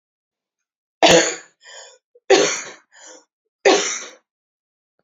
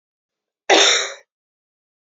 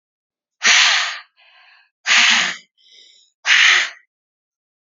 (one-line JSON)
{"three_cough_length": "5.0 s", "three_cough_amplitude": 30111, "three_cough_signal_mean_std_ratio": 0.33, "cough_length": "2.0 s", "cough_amplitude": 29397, "cough_signal_mean_std_ratio": 0.34, "exhalation_length": "4.9 s", "exhalation_amplitude": 32292, "exhalation_signal_mean_std_ratio": 0.44, "survey_phase": "beta (2021-08-13 to 2022-03-07)", "age": "45-64", "gender": "Female", "wearing_mask": "No", "symptom_none": true, "smoker_status": "Ex-smoker", "respiratory_condition_asthma": false, "respiratory_condition_other": false, "recruitment_source": "REACT", "submission_delay": "1 day", "covid_test_result": "Negative", "covid_test_method": "RT-qPCR"}